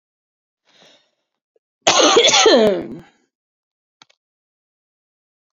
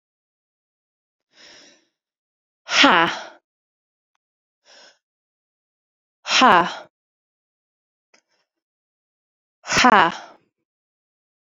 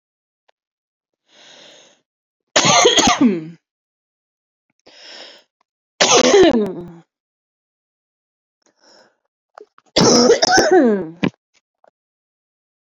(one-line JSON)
{"cough_length": "5.5 s", "cough_amplitude": 31883, "cough_signal_mean_std_ratio": 0.34, "exhalation_length": "11.5 s", "exhalation_amplitude": 29634, "exhalation_signal_mean_std_ratio": 0.23, "three_cough_length": "12.9 s", "three_cough_amplitude": 32768, "three_cough_signal_mean_std_ratio": 0.38, "survey_phase": "beta (2021-08-13 to 2022-03-07)", "age": "18-44", "gender": "Female", "wearing_mask": "No", "symptom_headache": true, "symptom_onset": "6 days", "smoker_status": "Never smoked", "respiratory_condition_asthma": false, "respiratory_condition_other": false, "recruitment_source": "REACT", "submission_delay": "3 days", "covid_test_result": "Negative", "covid_test_method": "RT-qPCR"}